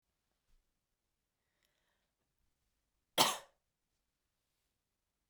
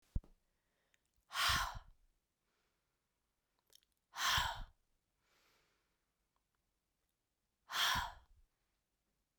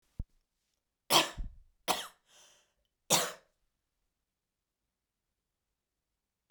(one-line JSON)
{"cough_length": "5.3 s", "cough_amplitude": 7678, "cough_signal_mean_std_ratio": 0.14, "exhalation_length": "9.4 s", "exhalation_amplitude": 2617, "exhalation_signal_mean_std_ratio": 0.3, "three_cough_length": "6.5 s", "three_cough_amplitude": 10002, "three_cough_signal_mean_std_ratio": 0.23, "survey_phase": "beta (2021-08-13 to 2022-03-07)", "age": "45-64", "gender": "Female", "wearing_mask": "No", "symptom_none": true, "smoker_status": "Never smoked", "respiratory_condition_asthma": false, "respiratory_condition_other": false, "recruitment_source": "Test and Trace", "submission_delay": "2 days", "covid_test_result": "Positive", "covid_test_method": "ePCR"}